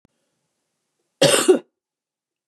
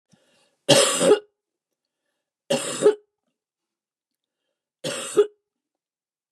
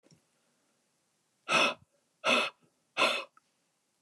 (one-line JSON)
{"cough_length": "2.5 s", "cough_amplitude": 26214, "cough_signal_mean_std_ratio": 0.29, "three_cough_length": "6.3 s", "three_cough_amplitude": 31706, "three_cough_signal_mean_std_ratio": 0.31, "exhalation_length": "4.0 s", "exhalation_amplitude": 8704, "exhalation_signal_mean_std_ratio": 0.34, "survey_phase": "beta (2021-08-13 to 2022-03-07)", "age": "45-64", "gender": "Female", "wearing_mask": "No", "symptom_cough_any": true, "smoker_status": "Never smoked", "respiratory_condition_asthma": false, "respiratory_condition_other": false, "recruitment_source": "REACT", "submission_delay": "2 days", "covid_test_result": "Negative", "covid_test_method": "RT-qPCR", "influenza_a_test_result": "Negative", "influenza_b_test_result": "Negative"}